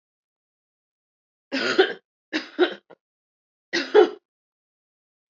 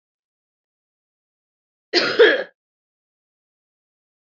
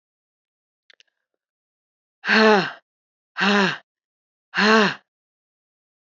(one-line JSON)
{"three_cough_length": "5.3 s", "three_cough_amplitude": 22447, "three_cough_signal_mean_std_ratio": 0.28, "cough_length": "4.3 s", "cough_amplitude": 25355, "cough_signal_mean_std_ratio": 0.24, "exhalation_length": "6.1 s", "exhalation_amplitude": 23636, "exhalation_signal_mean_std_ratio": 0.33, "survey_phase": "beta (2021-08-13 to 2022-03-07)", "age": "18-44", "gender": "Female", "wearing_mask": "No", "symptom_cough_any": true, "symptom_sore_throat": true, "symptom_fatigue": true, "symptom_headache": true, "symptom_change_to_sense_of_smell_or_taste": true, "symptom_onset": "4 days", "smoker_status": "Ex-smoker", "respiratory_condition_asthma": false, "respiratory_condition_other": false, "recruitment_source": "Test and Trace", "submission_delay": "1 day", "covid_test_result": "Positive", "covid_test_method": "RT-qPCR", "covid_ct_value": 34.2, "covid_ct_gene": "ORF1ab gene"}